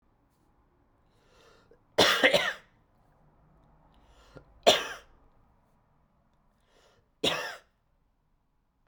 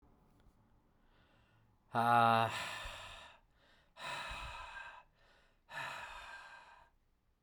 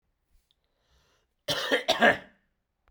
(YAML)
three_cough_length: 8.9 s
three_cough_amplitude: 17752
three_cough_signal_mean_std_ratio: 0.25
exhalation_length: 7.4 s
exhalation_amplitude: 4464
exhalation_signal_mean_std_ratio: 0.36
cough_length: 2.9 s
cough_amplitude: 15279
cough_signal_mean_std_ratio: 0.32
survey_phase: beta (2021-08-13 to 2022-03-07)
age: 18-44
gender: Male
wearing_mask: 'No'
symptom_runny_or_blocked_nose: true
symptom_headache: true
symptom_onset: 3 days
smoker_status: Never smoked
respiratory_condition_asthma: false
respiratory_condition_other: false
recruitment_source: Test and Trace
submission_delay: 2 days
covid_test_result: Positive
covid_test_method: RT-qPCR